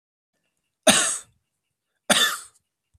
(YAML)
cough_length: 3.0 s
cough_amplitude: 32529
cough_signal_mean_std_ratio: 0.33
survey_phase: beta (2021-08-13 to 2022-03-07)
age: 45-64
gender: Male
wearing_mask: 'No'
symptom_cough_any: true
symptom_sore_throat: true
symptom_onset: 5 days
smoker_status: Never smoked
respiratory_condition_asthma: false
respiratory_condition_other: false
recruitment_source: Test and Trace
submission_delay: 2 days
covid_test_result: Negative
covid_test_method: RT-qPCR